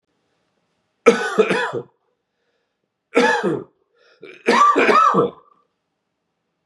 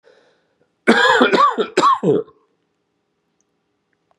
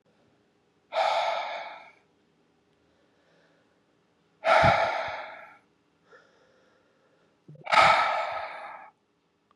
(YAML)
three_cough_length: 6.7 s
three_cough_amplitude: 32766
three_cough_signal_mean_std_ratio: 0.43
cough_length: 4.2 s
cough_amplitude: 32716
cough_signal_mean_std_ratio: 0.44
exhalation_length: 9.6 s
exhalation_amplitude: 17713
exhalation_signal_mean_std_ratio: 0.37
survey_phase: beta (2021-08-13 to 2022-03-07)
age: 45-64
gender: Male
wearing_mask: 'No'
symptom_cough_any: true
symptom_runny_or_blocked_nose: true
symptom_sore_throat: true
symptom_fever_high_temperature: true
symptom_headache: true
symptom_onset: 5 days
smoker_status: Never smoked
respiratory_condition_asthma: false
respiratory_condition_other: false
recruitment_source: Test and Trace
submission_delay: 2 days
covid_test_result: Positive
covid_test_method: RT-qPCR
covid_ct_value: 14.8
covid_ct_gene: ORF1ab gene
covid_ct_mean: 15.2
covid_viral_load: 11000000 copies/ml
covid_viral_load_category: High viral load (>1M copies/ml)